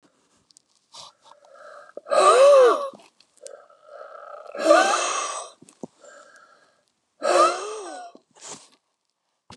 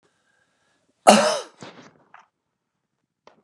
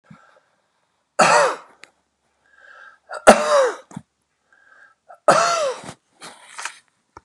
{
  "exhalation_length": "9.6 s",
  "exhalation_amplitude": 24156,
  "exhalation_signal_mean_std_ratio": 0.38,
  "cough_length": "3.4 s",
  "cough_amplitude": 32768,
  "cough_signal_mean_std_ratio": 0.23,
  "three_cough_length": "7.2 s",
  "three_cough_amplitude": 32768,
  "three_cough_signal_mean_std_ratio": 0.33,
  "survey_phase": "beta (2021-08-13 to 2022-03-07)",
  "age": "65+",
  "gender": "Male",
  "wearing_mask": "No",
  "symptom_cough_any": true,
  "smoker_status": "Never smoked",
  "respiratory_condition_asthma": false,
  "respiratory_condition_other": false,
  "recruitment_source": "REACT",
  "submission_delay": "2 days",
  "covid_test_result": "Negative",
  "covid_test_method": "RT-qPCR"
}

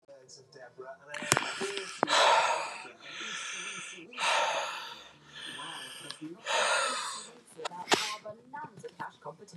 {
  "exhalation_length": "9.6 s",
  "exhalation_amplitude": 25028,
  "exhalation_signal_mean_std_ratio": 0.56,
  "survey_phase": "beta (2021-08-13 to 2022-03-07)",
  "age": "65+",
  "gender": "Male",
  "wearing_mask": "No",
  "symptom_none": true,
  "smoker_status": "Ex-smoker",
  "respiratory_condition_asthma": false,
  "respiratory_condition_other": false,
  "recruitment_source": "REACT",
  "submission_delay": "-1 day",
  "covid_test_result": "Negative",
  "covid_test_method": "RT-qPCR",
  "influenza_a_test_result": "Negative",
  "influenza_b_test_result": "Negative"
}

